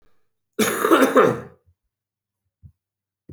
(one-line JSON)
{"cough_length": "3.3 s", "cough_amplitude": 26030, "cough_signal_mean_std_ratio": 0.36, "survey_phase": "beta (2021-08-13 to 2022-03-07)", "age": "45-64", "gender": "Male", "wearing_mask": "No", "symptom_cough_any": true, "symptom_runny_or_blocked_nose": true, "symptom_sore_throat": true, "symptom_fatigue": true, "symptom_headache": true, "smoker_status": "Never smoked", "respiratory_condition_asthma": false, "respiratory_condition_other": false, "recruitment_source": "Test and Trace", "submission_delay": "2 days", "covid_test_result": "Positive", "covid_test_method": "RT-qPCR", "covid_ct_value": 23.1, "covid_ct_gene": "ORF1ab gene"}